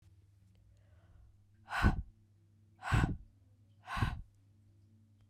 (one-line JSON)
{"exhalation_length": "5.3 s", "exhalation_amplitude": 5843, "exhalation_signal_mean_std_ratio": 0.34, "survey_phase": "beta (2021-08-13 to 2022-03-07)", "age": "45-64", "gender": "Female", "wearing_mask": "No", "symptom_runny_or_blocked_nose": true, "symptom_fatigue": true, "symptom_fever_high_temperature": true, "symptom_headache": true, "symptom_change_to_sense_of_smell_or_taste": true, "symptom_loss_of_taste": true, "symptom_onset": "2 days", "smoker_status": "Never smoked", "respiratory_condition_asthma": false, "respiratory_condition_other": false, "recruitment_source": "Test and Trace", "submission_delay": "2 days", "covid_test_result": "Positive", "covid_test_method": "RT-qPCR", "covid_ct_value": 21.5, "covid_ct_gene": "ORF1ab gene"}